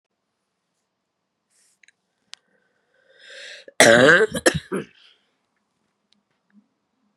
{"cough_length": "7.2 s", "cough_amplitude": 32768, "cough_signal_mean_std_ratio": 0.24, "survey_phase": "beta (2021-08-13 to 2022-03-07)", "age": "45-64", "gender": "Female", "wearing_mask": "No", "symptom_cough_any": true, "symptom_runny_or_blocked_nose": true, "symptom_shortness_of_breath": true, "symptom_sore_throat": true, "symptom_fatigue": true, "symptom_headache": true, "symptom_change_to_sense_of_smell_or_taste": true, "symptom_loss_of_taste": true, "symptom_onset": "3 days", "smoker_status": "Never smoked", "respiratory_condition_asthma": true, "respiratory_condition_other": false, "recruitment_source": "Test and Trace", "submission_delay": "2 days", "covid_test_result": "Positive", "covid_test_method": "RT-qPCR", "covid_ct_value": 15.1, "covid_ct_gene": "S gene", "covid_ct_mean": 15.4, "covid_viral_load": "8800000 copies/ml", "covid_viral_load_category": "High viral load (>1M copies/ml)"}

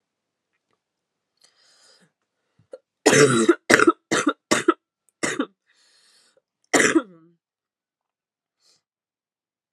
{"cough_length": "9.7 s", "cough_amplitude": 32768, "cough_signal_mean_std_ratio": 0.28, "survey_phase": "alpha (2021-03-01 to 2021-08-12)", "age": "18-44", "gender": "Female", "wearing_mask": "No", "symptom_cough_any": true, "symptom_new_continuous_cough": true, "symptom_headache": true, "symptom_change_to_sense_of_smell_or_taste": true, "symptom_loss_of_taste": true, "symptom_onset": "4 days", "smoker_status": "Never smoked", "respiratory_condition_asthma": false, "respiratory_condition_other": false, "recruitment_source": "Test and Trace", "submission_delay": "2 days", "covid_test_result": "Positive", "covid_test_method": "RT-qPCR", "covid_ct_value": 13.6, "covid_ct_gene": "ORF1ab gene", "covid_ct_mean": 13.9, "covid_viral_load": "27000000 copies/ml", "covid_viral_load_category": "High viral load (>1M copies/ml)"}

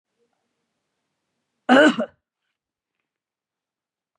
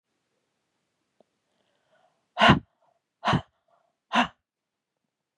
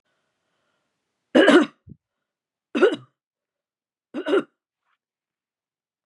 {"cough_length": "4.2 s", "cough_amplitude": 28619, "cough_signal_mean_std_ratio": 0.22, "exhalation_length": "5.4 s", "exhalation_amplitude": 28591, "exhalation_signal_mean_std_ratio": 0.22, "three_cough_length": "6.1 s", "three_cough_amplitude": 28964, "three_cough_signal_mean_std_ratio": 0.26, "survey_phase": "beta (2021-08-13 to 2022-03-07)", "age": "45-64", "gender": "Female", "wearing_mask": "No", "symptom_none": true, "smoker_status": "Never smoked", "respiratory_condition_asthma": false, "respiratory_condition_other": false, "recruitment_source": "REACT", "submission_delay": "2 days", "covid_test_result": "Negative", "covid_test_method": "RT-qPCR", "influenza_a_test_result": "Negative", "influenza_b_test_result": "Negative"}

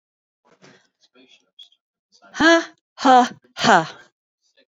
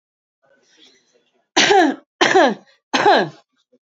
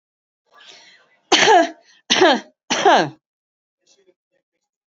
{"exhalation_length": "4.8 s", "exhalation_amplitude": 28289, "exhalation_signal_mean_std_ratio": 0.31, "three_cough_length": "3.8 s", "three_cough_amplitude": 29066, "three_cough_signal_mean_std_ratio": 0.42, "cough_length": "4.9 s", "cough_amplitude": 31368, "cough_signal_mean_std_ratio": 0.36, "survey_phase": "beta (2021-08-13 to 2022-03-07)", "age": "45-64", "gender": "Female", "wearing_mask": "No", "symptom_cough_any": true, "symptom_shortness_of_breath": true, "symptom_abdominal_pain": true, "symptom_fatigue": true, "symptom_headache": true, "symptom_onset": "12 days", "smoker_status": "Current smoker (1 to 10 cigarettes per day)", "respiratory_condition_asthma": true, "respiratory_condition_other": false, "recruitment_source": "REACT", "submission_delay": "1 day", "covid_test_result": "Negative", "covid_test_method": "RT-qPCR"}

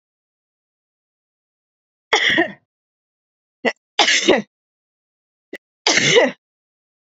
{"three_cough_length": "7.2 s", "three_cough_amplitude": 32768, "three_cough_signal_mean_std_ratio": 0.33, "survey_phase": "beta (2021-08-13 to 2022-03-07)", "age": "45-64", "gender": "Female", "wearing_mask": "No", "symptom_change_to_sense_of_smell_or_taste": true, "symptom_loss_of_taste": true, "smoker_status": "Never smoked", "respiratory_condition_asthma": false, "respiratory_condition_other": false, "recruitment_source": "Test and Trace", "submission_delay": "1 day", "covid_test_result": "Positive", "covid_test_method": "RT-qPCR", "covid_ct_value": 21.1, "covid_ct_gene": "ORF1ab gene", "covid_ct_mean": 21.3, "covid_viral_load": "100000 copies/ml", "covid_viral_load_category": "Low viral load (10K-1M copies/ml)"}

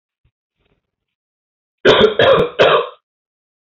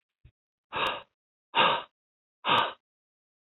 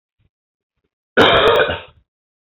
{"three_cough_length": "3.7 s", "three_cough_amplitude": 29231, "three_cough_signal_mean_std_ratio": 0.4, "exhalation_length": "3.4 s", "exhalation_amplitude": 11489, "exhalation_signal_mean_std_ratio": 0.36, "cough_length": "2.5 s", "cough_amplitude": 27925, "cough_signal_mean_std_ratio": 0.4, "survey_phase": "beta (2021-08-13 to 2022-03-07)", "age": "18-44", "gender": "Male", "wearing_mask": "No", "symptom_cough_any": true, "symptom_runny_or_blocked_nose": true, "smoker_status": "Never smoked", "respiratory_condition_asthma": false, "respiratory_condition_other": false, "recruitment_source": "Test and Trace", "submission_delay": "1 day", "covid_test_result": "Positive", "covid_test_method": "RT-qPCR", "covid_ct_value": 30.9, "covid_ct_gene": "N gene"}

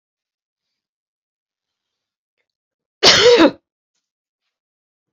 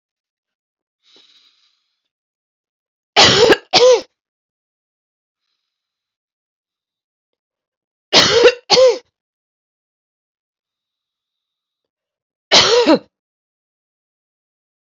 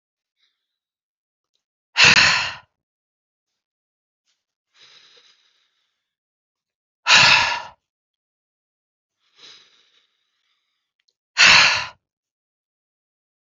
{"three_cough_length": "5.1 s", "three_cough_amplitude": 31466, "three_cough_signal_mean_std_ratio": 0.25, "cough_length": "14.8 s", "cough_amplitude": 32767, "cough_signal_mean_std_ratio": 0.28, "exhalation_length": "13.6 s", "exhalation_amplitude": 31842, "exhalation_signal_mean_std_ratio": 0.25, "survey_phase": "beta (2021-08-13 to 2022-03-07)", "age": "45-64", "gender": "Female", "wearing_mask": "No", "symptom_none": true, "smoker_status": "Ex-smoker", "respiratory_condition_asthma": false, "respiratory_condition_other": false, "recruitment_source": "REACT", "submission_delay": "3 days", "covid_test_result": "Negative", "covid_test_method": "RT-qPCR", "influenza_a_test_result": "Negative", "influenza_b_test_result": "Negative"}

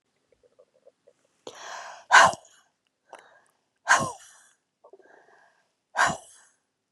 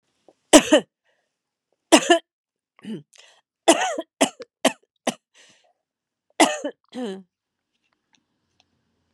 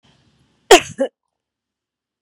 {"exhalation_length": "6.9 s", "exhalation_amplitude": 27172, "exhalation_signal_mean_std_ratio": 0.23, "three_cough_length": "9.1 s", "three_cough_amplitude": 32767, "three_cough_signal_mean_std_ratio": 0.25, "cough_length": "2.2 s", "cough_amplitude": 32768, "cough_signal_mean_std_ratio": 0.2, "survey_phase": "beta (2021-08-13 to 2022-03-07)", "age": "45-64", "gender": "Female", "wearing_mask": "Yes", "symptom_fatigue": true, "symptom_headache": true, "symptom_onset": "3 days", "smoker_status": "Ex-smoker", "respiratory_condition_asthma": false, "respiratory_condition_other": false, "recruitment_source": "Test and Trace", "submission_delay": "2 days", "covid_test_result": "Positive", "covid_test_method": "RT-qPCR", "covid_ct_value": 14.1, "covid_ct_gene": "ORF1ab gene", "covid_ct_mean": 15.1, "covid_viral_load": "11000000 copies/ml", "covid_viral_load_category": "High viral load (>1M copies/ml)"}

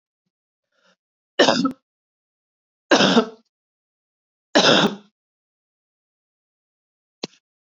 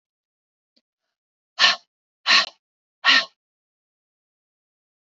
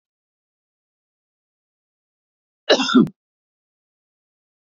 {"three_cough_length": "7.8 s", "three_cough_amplitude": 26459, "three_cough_signal_mean_std_ratio": 0.28, "exhalation_length": "5.1 s", "exhalation_amplitude": 24335, "exhalation_signal_mean_std_ratio": 0.25, "cough_length": "4.6 s", "cough_amplitude": 28262, "cough_signal_mean_std_ratio": 0.2, "survey_phase": "beta (2021-08-13 to 2022-03-07)", "age": "45-64", "gender": "Female", "wearing_mask": "No", "symptom_none": true, "smoker_status": "Never smoked", "respiratory_condition_asthma": false, "respiratory_condition_other": false, "recruitment_source": "REACT", "submission_delay": "2 days", "covid_test_result": "Negative", "covid_test_method": "RT-qPCR", "influenza_a_test_result": "Negative", "influenza_b_test_result": "Negative"}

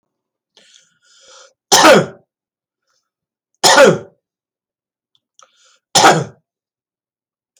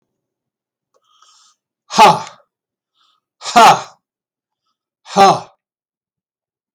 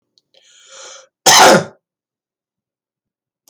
{"three_cough_length": "7.6 s", "three_cough_amplitude": 32768, "three_cough_signal_mean_std_ratio": 0.29, "exhalation_length": "6.7 s", "exhalation_amplitude": 32768, "exhalation_signal_mean_std_ratio": 0.27, "cough_length": "3.5 s", "cough_amplitude": 32768, "cough_signal_mean_std_ratio": 0.29, "survey_phase": "beta (2021-08-13 to 2022-03-07)", "age": "65+", "gender": "Male", "wearing_mask": "No", "symptom_none": true, "smoker_status": "Ex-smoker", "respiratory_condition_asthma": false, "respiratory_condition_other": false, "recruitment_source": "REACT", "submission_delay": "1 day", "covid_test_result": "Negative", "covid_test_method": "RT-qPCR", "influenza_a_test_result": "Negative", "influenza_b_test_result": "Negative"}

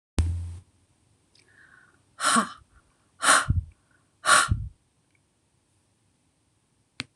{"exhalation_length": "7.2 s", "exhalation_amplitude": 20786, "exhalation_signal_mean_std_ratio": 0.33, "survey_phase": "beta (2021-08-13 to 2022-03-07)", "age": "45-64", "gender": "Female", "wearing_mask": "No", "symptom_headache": true, "smoker_status": "Never smoked", "respiratory_condition_asthma": false, "respiratory_condition_other": false, "recruitment_source": "REACT", "submission_delay": "1 day", "covid_test_result": "Negative", "covid_test_method": "RT-qPCR"}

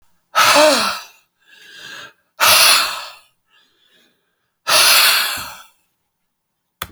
{"exhalation_length": "6.9 s", "exhalation_amplitude": 32768, "exhalation_signal_mean_std_ratio": 0.45, "survey_phase": "beta (2021-08-13 to 2022-03-07)", "age": "65+", "gender": "Male", "wearing_mask": "No", "symptom_none": true, "smoker_status": "Ex-smoker", "respiratory_condition_asthma": false, "respiratory_condition_other": true, "recruitment_source": "REACT", "submission_delay": "1 day", "covid_test_result": "Negative", "covid_test_method": "RT-qPCR"}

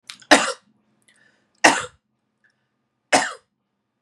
{"three_cough_length": "4.0 s", "three_cough_amplitude": 32768, "three_cough_signal_mean_std_ratio": 0.25, "survey_phase": "beta (2021-08-13 to 2022-03-07)", "age": "18-44", "gender": "Female", "wearing_mask": "No", "symptom_none": true, "smoker_status": "Ex-smoker", "respiratory_condition_asthma": false, "respiratory_condition_other": false, "recruitment_source": "REACT", "submission_delay": "1 day", "covid_test_result": "Negative", "covid_test_method": "RT-qPCR", "influenza_a_test_result": "Negative", "influenza_b_test_result": "Negative"}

